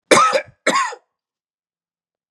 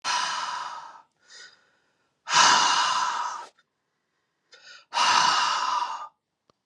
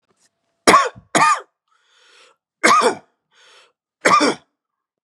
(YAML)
cough_length: 2.3 s
cough_amplitude: 32767
cough_signal_mean_std_ratio: 0.38
exhalation_length: 6.7 s
exhalation_amplitude: 21706
exhalation_signal_mean_std_ratio: 0.54
three_cough_length: 5.0 s
three_cough_amplitude: 32768
three_cough_signal_mean_std_ratio: 0.37
survey_phase: beta (2021-08-13 to 2022-03-07)
age: 45-64
gender: Male
wearing_mask: 'No'
symptom_cough_any: true
symptom_runny_or_blocked_nose: true
symptom_sore_throat: true
symptom_fatigue: true
symptom_headache: true
symptom_onset: 3 days
smoker_status: Never smoked
respiratory_condition_asthma: false
respiratory_condition_other: false
recruitment_source: Test and Trace
submission_delay: 1 day
covid_test_result: Negative
covid_test_method: RT-qPCR